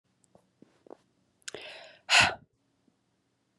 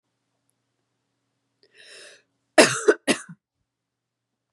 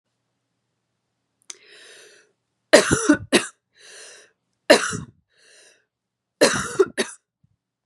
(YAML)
exhalation_length: 3.6 s
exhalation_amplitude: 13715
exhalation_signal_mean_std_ratio: 0.22
cough_length: 4.5 s
cough_amplitude: 32767
cough_signal_mean_std_ratio: 0.2
three_cough_length: 7.9 s
three_cough_amplitude: 32767
three_cough_signal_mean_std_ratio: 0.27
survey_phase: beta (2021-08-13 to 2022-03-07)
age: 18-44
gender: Female
wearing_mask: 'No'
symptom_runny_or_blocked_nose: true
symptom_shortness_of_breath: true
symptom_fatigue: true
symptom_headache: true
symptom_onset: 3 days
smoker_status: Never smoked
respiratory_condition_asthma: false
respiratory_condition_other: false
recruitment_source: Test and Trace
submission_delay: 1 day
covid_test_result: Positive
covid_test_method: RT-qPCR
covid_ct_value: 15.1
covid_ct_gene: ORF1ab gene
covid_ct_mean: 15.6
covid_viral_load: 7800000 copies/ml
covid_viral_load_category: High viral load (>1M copies/ml)